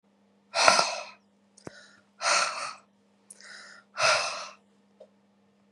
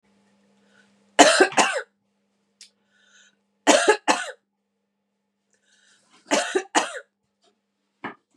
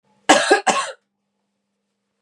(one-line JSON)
{"exhalation_length": "5.7 s", "exhalation_amplitude": 32767, "exhalation_signal_mean_std_ratio": 0.37, "three_cough_length": "8.4 s", "three_cough_amplitude": 32767, "three_cough_signal_mean_std_ratio": 0.29, "cough_length": "2.2 s", "cough_amplitude": 32767, "cough_signal_mean_std_ratio": 0.35, "survey_phase": "beta (2021-08-13 to 2022-03-07)", "age": "45-64", "gender": "Female", "wearing_mask": "No", "symptom_none": true, "smoker_status": "Never smoked", "respiratory_condition_asthma": false, "respiratory_condition_other": false, "recruitment_source": "REACT", "submission_delay": "2 days", "covid_test_result": "Negative", "covid_test_method": "RT-qPCR", "influenza_a_test_result": "Negative", "influenza_b_test_result": "Negative"}